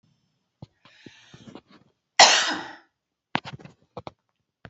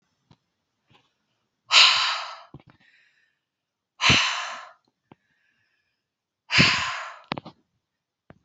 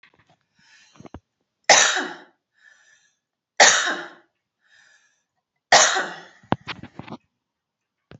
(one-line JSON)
{"cough_length": "4.7 s", "cough_amplitude": 32081, "cough_signal_mean_std_ratio": 0.22, "exhalation_length": "8.4 s", "exhalation_amplitude": 26685, "exhalation_signal_mean_std_ratio": 0.31, "three_cough_length": "8.2 s", "three_cough_amplitude": 32720, "three_cough_signal_mean_std_ratio": 0.28, "survey_phase": "beta (2021-08-13 to 2022-03-07)", "age": "18-44", "gender": "Female", "wearing_mask": "No", "symptom_none": true, "smoker_status": "Never smoked", "respiratory_condition_asthma": false, "respiratory_condition_other": false, "recruitment_source": "REACT", "submission_delay": "4 days", "covid_test_result": "Negative", "covid_test_method": "RT-qPCR", "influenza_a_test_result": "Negative", "influenza_b_test_result": "Negative"}